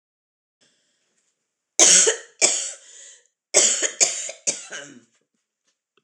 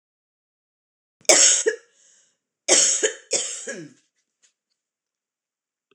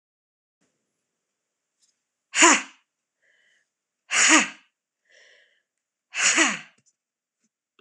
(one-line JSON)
{"three_cough_length": "6.0 s", "three_cough_amplitude": 26028, "three_cough_signal_mean_std_ratio": 0.35, "cough_length": "5.9 s", "cough_amplitude": 26028, "cough_signal_mean_std_ratio": 0.32, "exhalation_length": "7.8 s", "exhalation_amplitude": 25947, "exhalation_signal_mean_std_ratio": 0.27, "survey_phase": "beta (2021-08-13 to 2022-03-07)", "age": "45-64", "gender": "Female", "wearing_mask": "Yes", "symptom_cough_any": true, "symptom_runny_or_blocked_nose": true, "symptom_shortness_of_breath": true, "symptom_fatigue": true, "symptom_fever_high_temperature": true, "symptom_headache": true, "symptom_change_to_sense_of_smell_or_taste": true, "symptom_other": true, "smoker_status": "Never smoked", "respiratory_condition_asthma": false, "respiratory_condition_other": false, "recruitment_source": "Test and Trace", "submission_delay": "1 day", "covid_test_result": "Positive", "covid_test_method": "RT-qPCR", "covid_ct_value": 17.8, "covid_ct_gene": "ORF1ab gene"}